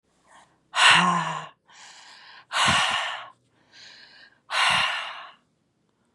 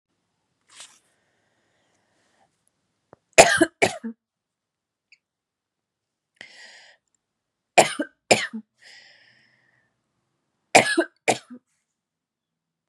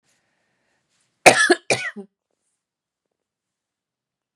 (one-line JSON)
{"exhalation_length": "6.1 s", "exhalation_amplitude": 21704, "exhalation_signal_mean_std_ratio": 0.45, "three_cough_length": "12.9 s", "three_cough_amplitude": 32768, "three_cough_signal_mean_std_ratio": 0.19, "cough_length": "4.4 s", "cough_amplitude": 32768, "cough_signal_mean_std_ratio": 0.21, "survey_phase": "beta (2021-08-13 to 2022-03-07)", "age": "18-44", "gender": "Female", "wearing_mask": "No", "symptom_cough_any": true, "symptom_runny_or_blocked_nose": true, "symptom_sore_throat": true, "symptom_fatigue": true, "symptom_headache": true, "symptom_onset": "3 days", "smoker_status": "Current smoker (e-cigarettes or vapes only)", "respiratory_condition_asthma": false, "respiratory_condition_other": false, "recruitment_source": "Test and Trace", "submission_delay": "1 day", "covid_test_result": "Positive", "covid_test_method": "RT-qPCR", "covid_ct_value": 20.5, "covid_ct_gene": "N gene", "covid_ct_mean": 20.8, "covid_viral_load": "150000 copies/ml", "covid_viral_load_category": "Low viral load (10K-1M copies/ml)"}